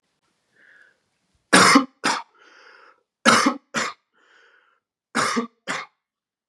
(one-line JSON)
{"three_cough_length": "6.5 s", "three_cough_amplitude": 31523, "three_cough_signal_mean_std_ratio": 0.33, "survey_phase": "beta (2021-08-13 to 2022-03-07)", "age": "18-44", "gender": "Male", "wearing_mask": "No", "symptom_cough_any": true, "symptom_runny_or_blocked_nose": true, "symptom_sore_throat": true, "symptom_fatigue": true, "symptom_onset": "4 days", "smoker_status": "Never smoked", "respiratory_condition_asthma": false, "respiratory_condition_other": false, "recruitment_source": "Test and Trace", "submission_delay": "2 days", "covid_test_result": "Negative", "covid_test_method": "RT-qPCR"}